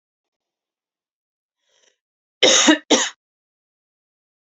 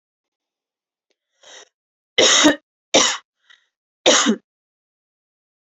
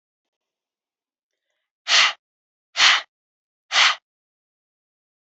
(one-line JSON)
{"cough_length": "4.4 s", "cough_amplitude": 32407, "cough_signal_mean_std_ratio": 0.26, "three_cough_length": "5.7 s", "three_cough_amplitude": 28177, "three_cough_signal_mean_std_ratio": 0.31, "exhalation_length": "5.2 s", "exhalation_amplitude": 29152, "exhalation_signal_mean_std_ratio": 0.28, "survey_phase": "beta (2021-08-13 to 2022-03-07)", "age": "18-44", "gender": "Female", "wearing_mask": "No", "symptom_none": true, "smoker_status": "Never smoked", "respiratory_condition_asthma": false, "respiratory_condition_other": false, "recruitment_source": "REACT", "submission_delay": "1 day", "covid_test_result": "Positive", "covid_test_method": "RT-qPCR", "covid_ct_value": 31.7, "covid_ct_gene": "E gene", "influenza_a_test_result": "Negative", "influenza_b_test_result": "Negative"}